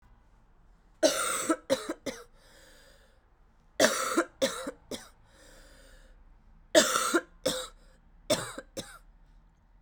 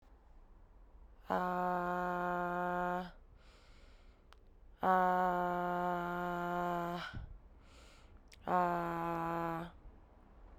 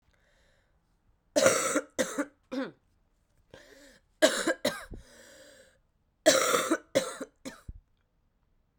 three_cough_length: 9.8 s
three_cough_amplitude: 15045
three_cough_signal_mean_std_ratio: 0.38
exhalation_length: 10.6 s
exhalation_amplitude: 4394
exhalation_signal_mean_std_ratio: 0.55
cough_length: 8.8 s
cough_amplitude: 19558
cough_signal_mean_std_ratio: 0.36
survey_phase: alpha (2021-03-01 to 2021-08-12)
age: 18-44
gender: Female
wearing_mask: 'No'
symptom_cough_any: true
symptom_fatigue: true
symptom_change_to_sense_of_smell_or_taste: true
symptom_loss_of_taste: true
smoker_status: Ex-smoker
respiratory_condition_asthma: false
respiratory_condition_other: false
recruitment_source: Test and Trace
submission_delay: 2 days
covid_test_result: Positive
covid_test_method: RT-qPCR
covid_ct_value: 18.1
covid_ct_gene: ORF1ab gene
covid_ct_mean: 18.5
covid_viral_load: 860000 copies/ml
covid_viral_load_category: Low viral load (10K-1M copies/ml)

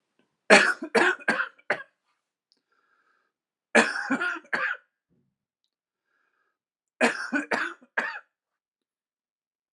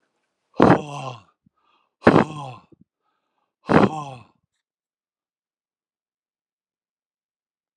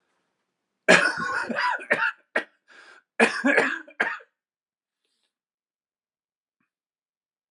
three_cough_length: 9.7 s
three_cough_amplitude: 30831
three_cough_signal_mean_std_ratio: 0.32
exhalation_length: 7.8 s
exhalation_amplitude: 32768
exhalation_signal_mean_std_ratio: 0.23
cough_length: 7.5 s
cough_amplitude: 28929
cough_signal_mean_std_ratio: 0.35
survey_phase: beta (2021-08-13 to 2022-03-07)
age: 45-64
gender: Male
wearing_mask: 'No'
symptom_cough_any: true
symptom_new_continuous_cough: true
symptom_runny_or_blocked_nose: true
symptom_shortness_of_breath: true
symptom_abdominal_pain: true
symptom_fatigue: true
symptom_headache: true
symptom_change_to_sense_of_smell_or_taste: true
symptom_loss_of_taste: true
smoker_status: Ex-smoker
respiratory_condition_asthma: false
respiratory_condition_other: false
recruitment_source: Test and Trace
submission_delay: 2 days
covid_test_result: Positive
covid_test_method: LFT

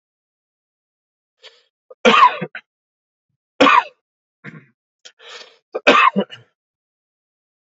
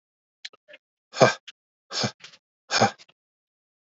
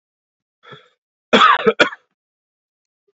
three_cough_length: 7.7 s
three_cough_amplitude: 31808
three_cough_signal_mean_std_ratio: 0.28
exhalation_length: 3.9 s
exhalation_amplitude: 27338
exhalation_signal_mean_std_ratio: 0.25
cough_length: 3.2 s
cough_amplitude: 28817
cough_signal_mean_std_ratio: 0.29
survey_phase: beta (2021-08-13 to 2022-03-07)
age: 45-64
gender: Male
wearing_mask: 'No'
symptom_cough_any: true
symptom_runny_or_blocked_nose: true
symptom_sore_throat: true
symptom_fatigue: true
symptom_headache: true
smoker_status: Never smoked
respiratory_condition_asthma: true
respiratory_condition_other: false
recruitment_source: Test and Trace
submission_delay: 2 days
covid_test_result: Positive
covid_test_method: LFT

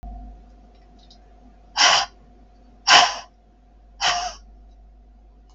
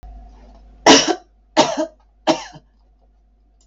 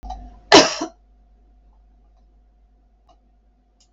exhalation_length: 5.5 s
exhalation_amplitude: 32768
exhalation_signal_mean_std_ratio: 0.33
three_cough_length: 3.7 s
three_cough_amplitude: 32768
three_cough_signal_mean_std_ratio: 0.33
cough_length: 3.9 s
cough_amplitude: 32768
cough_signal_mean_std_ratio: 0.21
survey_phase: beta (2021-08-13 to 2022-03-07)
age: 45-64
gender: Female
wearing_mask: 'No'
symptom_none: true
smoker_status: Never smoked
respiratory_condition_asthma: false
respiratory_condition_other: false
recruitment_source: REACT
submission_delay: 3 days
covid_test_result: Negative
covid_test_method: RT-qPCR
influenza_a_test_result: Negative
influenza_b_test_result: Negative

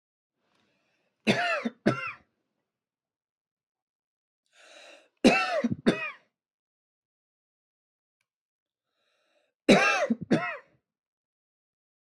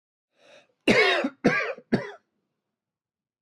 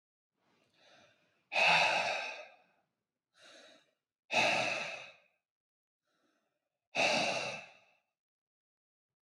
three_cough_length: 12.0 s
three_cough_amplitude: 16299
three_cough_signal_mean_std_ratio: 0.29
cough_length: 3.4 s
cough_amplitude: 15446
cough_signal_mean_std_ratio: 0.38
exhalation_length: 9.2 s
exhalation_amplitude: 4867
exhalation_signal_mean_std_ratio: 0.38
survey_phase: beta (2021-08-13 to 2022-03-07)
age: 18-44
gender: Male
wearing_mask: 'No'
symptom_none: true
symptom_onset: 5 days
smoker_status: Never smoked
respiratory_condition_asthma: true
respiratory_condition_other: false
recruitment_source: REACT
submission_delay: 1 day
covid_test_result: Negative
covid_test_method: RT-qPCR
influenza_a_test_result: Negative
influenza_b_test_result: Negative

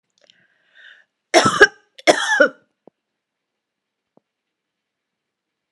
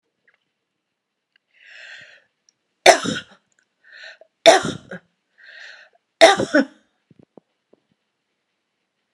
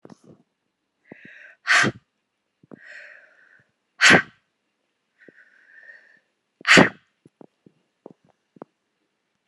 cough_length: 5.7 s
cough_amplitude: 32768
cough_signal_mean_std_ratio: 0.25
three_cough_length: 9.1 s
three_cough_amplitude: 32768
three_cough_signal_mean_std_ratio: 0.22
exhalation_length: 9.5 s
exhalation_amplitude: 32766
exhalation_signal_mean_std_ratio: 0.21
survey_phase: beta (2021-08-13 to 2022-03-07)
age: 45-64
gender: Female
wearing_mask: 'No'
symptom_none: true
smoker_status: Never smoked
respiratory_condition_asthma: false
respiratory_condition_other: false
recruitment_source: REACT
submission_delay: 1 day
covid_test_result: Negative
covid_test_method: RT-qPCR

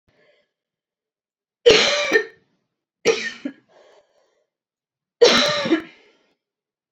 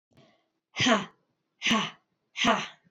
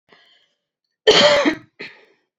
three_cough_length: 6.9 s
three_cough_amplitude: 30740
three_cough_signal_mean_std_ratio: 0.33
exhalation_length: 2.9 s
exhalation_amplitude: 13251
exhalation_signal_mean_std_ratio: 0.43
cough_length: 2.4 s
cough_amplitude: 29177
cough_signal_mean_std_ratio: 0.37
survey_phase: alpha (2021-03-01 to 2021-08-12)
age: 45-64
gender: Female
wearing_mask: 'No'
symptom_cough_any: true
symptom_headache: true
symptom_onset: 3 days
smoker_status: Never smoked
respiratory_condition_asthma: true
respiratory_condition_other: false
recruitment_source: Test and Trace
submission_delay: 2 days
covid_test_result: Positive
covid_test_method: RT-qPCR
covid_ct_value: 25.2
covid_ct_gene: ORF1ab gene
covid_ct_mean: 25.4
covid_viral_load: 4800 copies/ml
covid_viral_load_category: Minimal viral load (< 10K copies/ml)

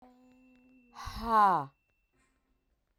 exhalation_length: 3.0 s
exhalation_amplitude: 6937
exhalation_signal_mean_std_ratio: 0.31
survey_phase: beta (2021-08-13 to 2022-03-07)
age: 18-44
gender: Female
wearing_mask: 'No'
symptom_cough_any: true
symptom_new_continuous_cough: true
symptom_sore_throat: true
symptom_abdominal_pain: true
symptom_diarrhoea: true
symptom_headache: true
symptom_change_to_sense_of_smell_or_taste: true
symptom_loss_of_taste: true
symptom_onset: 6 days
smoker_status: Ex-smoker
respiratory_condition_asthma: false
respiratory_condition_other: false
recruitment_source: Test and Trace
submission_delay: 3 days
covid_test_result: Positive
covid_test_method: ePCR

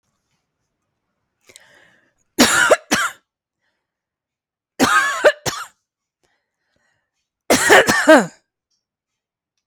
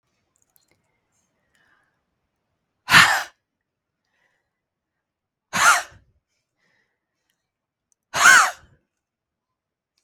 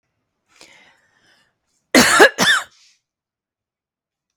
three_cough_length: 9.7 s
three_cough_amplitude: 32768
three_cough_signal_mean_std_ratio: 0.33
exhalation_length: 10.0 s
exhalation_amplitude: 32767
exhalation_signal_mean_std_ratio: 0.23
cough_length: 4.4 s
cough_amplitude: 32768
cough_signal_mean_std_ratio: 0.28
survey_phase: beta (2021-08-13 to 2022-03-07)
age: 45-64
gender: Female
wearing_mask: 'No'
symptom_none: true
smoker_status: Never smoked
respiratory_condition_asthma: true
respiratory_condition_other: false
recruitment_source: REACT
submission_delay: 1 day
covid_test_result: Negative
covid_test_method: RT-qPCR
influenza_a_test_result: Negative
influenza_b_test_result: Negative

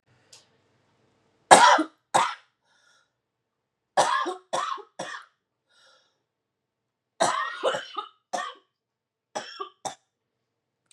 three_cough_length: 10.9 s
three_cough_amplitude: 32768
three_cough_signal_mean_std_ratio: 0.28
survey_phase: beta (2021-08-13 to 2022-03-07)
age: 18-44
gender: Female
wearing_mask: 'No'
symptom_cough_any: true
symptom_runny_or_blocked_nose: true
symptom_shortness_of_breath: true
symptom_sore_throat: true
symptom_abdominal_pain: true
symptom_diarrhoea: true
symptom_fatigue: true
symptom_fever_high_temperature: true
symptom_headache: true
symptom_change_to_sense_of_smell_or_taste: true
symptom_loss_of_taste: true
symptom_other: true
symptom_onset: 2 days
smoker_status: Never smoked
respiratory_condition_asthma: false
respiratory_condition_other: false
recruitment_source: Test and Trace
submission_delay: 2 days
covid_test_result: Positive
covid_test_method: RT-qPCR
covid_ct_value: 17.6
covid_ct_gene: N gene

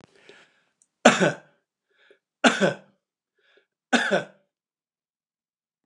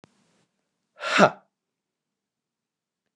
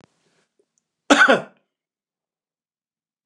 three_cough_length: 5.9 s
three_cough_amplitude: 29204
three_cough_signal_mean_std_ratio: 0.27
exhalation_length: 3.2 s
exhalation_amplitude: 27433
exhalation_signal_mean_std_ratio: 0.2
cough_length: 3.3 s
cough_amplitude: 29203
cough_signal_mean_std_ratio: 0.23
survey_phase: beta (2021-08-13 to 2022-03-07)
age: 65+
gender: Male
wearing_mask: 'No'
symptom_none: true
smoker_status: Ex-smoker
respiratory_condition_asthma: false
respiratory_condition_other: false
recruitment_source: REACT
submission_delay: 1 day
covid_test_result: Negative
covid_test_method: RT-qPCR
influenza_a_test_result: Negative
influenza_b_test_result: Negative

